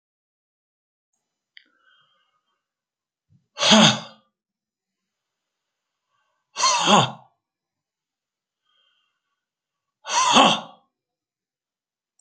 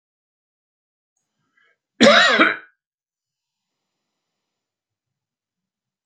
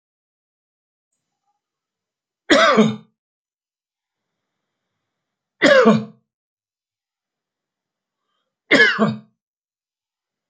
exhalation_length: 12.2 s
exhalation_amplitude: 32768
exhalation_signal_mean_std_ratio: 0.26
cough_length: 6.1 s
cough_amplitude: 30561
cough_signal_mean_std_ratio: 0.23
three_cough_length: 10.5 s
three_cough_amplitude: 29057
three_cough_signal_mean_std_ratio: 0.27
survey_phase: beta (2021-08-13 to 2022-03-07)
age: 65+
gender: Male
wearing_mask: 'No'
symptom_cough_any: true
symptom_fatigue: true
smoker_status: Ex-smoker
respiratory_condition_asthma: false
respiratory_condition_other: false
recruitment_source: REACT
submission_delay: 6 days
covid_test_result: Negative
covid_test_method: RT-qPCR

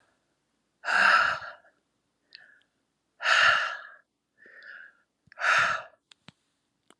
exhalation_length: 7.0 s
exhalation_amplitude: 12774
exhalation_signal_mean_std_ratio: 0.38
survey_phase: alpha (2021-03-01 to 2021-08-12)
age: 45-64
gender: Female
wearing_mask: 'No'
symptom_cough_any: true
symptom_shortness_of_breath: true
symptom_headache: true
symptom_onset: 8 days
smoker_status: Current smoker (11 or more cigarettes per day)
respiratory_condition_asthma: false
respiratory_condition_other: false
recruitment_source: Test and Trace
submission_delay: 2 days
covid_test_result: Positive
covid_test_method: RT-qPCR
covid_ct_value: 14.9
covid_ct_gene: N gene
covid_ct_mean: 14.9
covid_viral_load: 13000000 copies/ml
covid_viral_load_category: High viral load (>1M copies/ml)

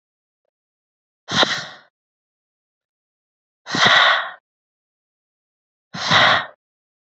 exhalation_length: 7.1 s
exhalation_amplitude: 31103
exhalation_signal_mean_std_ratio: 0.33
survey_phase: beta (2021-08-13 to 2022-03-07)
age: 18-44
gender: Female
wearing_mask: 'No'
symptom_cough_any: true
symptom_change_to_sense_of_smell_or_taste: true
symptom_onset: 1 day
smoker_status: Never smoked
respiratory_condition_asthma: false
respiratory_condition_other: false
recruitment_source: Test and Trace
submission_delay: 1 day
covid_test_result: Negative
covid_test_method: RT-qPCR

